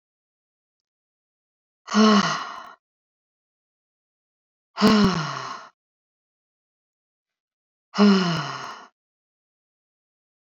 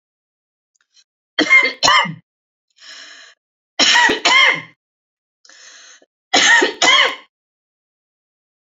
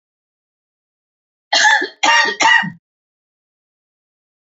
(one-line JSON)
{"exhalation_length": "10.4 s", "exhalation_amplitude": 18267, "exhalation_signal_mean_std_ratio": 0.32, "three_cough_length": "8.6 s", "three_cough_amplitude": 32768, "three_cough_signal_mean_std_ratio": 0.41, "cough_length": "4.4 s", "cough_amplitude": 30004, "cough_signal_mean_std_ratio": 0.38, "survey_phase": "beta (2021-08-13 to 2022-03-07)", "age": "65+", "gender": "Female", "wearing_mask": "No", "symptom_none": true, "smoker_status": "Never smoked", "respiratory_condition_asthma": false, "respiratory_condition_other": false, "recruitment_source": "REACT", "submission_delay": "1 day", "covid_test_result": "Negative", "covid_test_method": "RT-qPCR", "influenza_a_test_result": "Negative", "influenza_b_test_result": "Negative"}